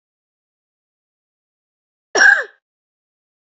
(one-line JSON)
{"cough_length": "3.6 s", "cough_amplitude": 28003, "cough_signal_mean_std_ratio": 0.22, "survey_phase": "beta (2021-08-13 to 2022-03-07)", "age": "18-44", "gender": "Female", "wearing_mask": "No", "symptom_cough_any": true, "symptom_runny_or_blocked_nose": true, "symptom_shortness_of_breath": true, "symptom_fatigue": true, "symptom_headache": true, "smoker_status": "Never smoked", "respiratory_condition_asthma": true, "respiratory_condition_other": true, "recruitment_source": "Test and Trace", "submission_delay": "2 days", "covid_test_result": "Positive", "covid_test_method": "RT-qPCR", "covid_ct_value": 31.6, "covid_ct_gene": "ORF1ab gene", "covid_ct_mean": 32.4, "covid_viral_load": "24 copies/ml", "covid_viral_load_category": "Minimal viral load (< 10K copies/ml)"}